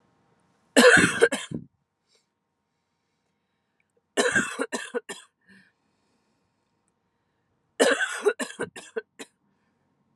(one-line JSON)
{"three_cough_length": "10.2 s", "three_cough_amplitude": 24179, "three_cough_signal_mean_std_ratio": 0.29, "survey_phase": "alpha (2021-03-01 to 2021-08-12)", "age": "18-44", "gender": "Female", "wearing_mask": "No", "symptom_cough_any": true, "symptom_shortness_of_breath": true, "symptom_fatigue": true, "symptom_change_to_sense_of_smell_or_taste": true, "symptom_loss_of_taste": true, "symptom_onset": "3 days", "smoker_status": "Never smoked", "respiratory_condition_asthma": false, "respiratory_condition_other": false, "recruitment_source": "Test and Trace", "submission_delay": "1 day", "covid_test_result": "Positive", "covid_test_method": "RT-qPCR", "covid_ct_value": 16.0, "covid_ct_gene": "ORF1ab gene", "covid_ct_mean": 16.2, "covid_viral_load": "4700000 copies/ml", "covid_viral_load_category": "High viral load (>1M copies/ml)"}